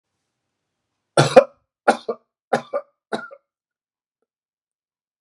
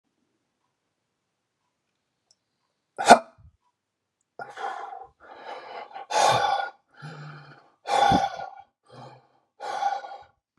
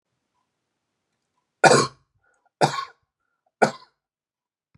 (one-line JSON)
{"cough_length": "5.2 s", "cough_amplitude": 32768, "cough_signal_mean_std_ratio": 0.2, "exhalation_length": "10.6 s", "exhalation_amplitude": 32768, "exhalation_signal_mean_std_ratio": 0.3, "three_cough_length": "4.8 s", "three_cough_amplitude": 32035, "three_cough_signal_mean_std_ratio": 0.22, "survey_phase": "beta (2021-08-13 to 2022-03-07)", "age": "65+", "gender": "Male", "wearing_mask": "No", "symptom_none": true, "smoker_status": "Never smoked", "respiratory_condition_asthma": false, "respiratory_condition_other": false, "recruitment_source": "REACT", "submission_delay": "2 days", "covid_test_result": "Negative", "covid_test_method": "RT-qPCR"}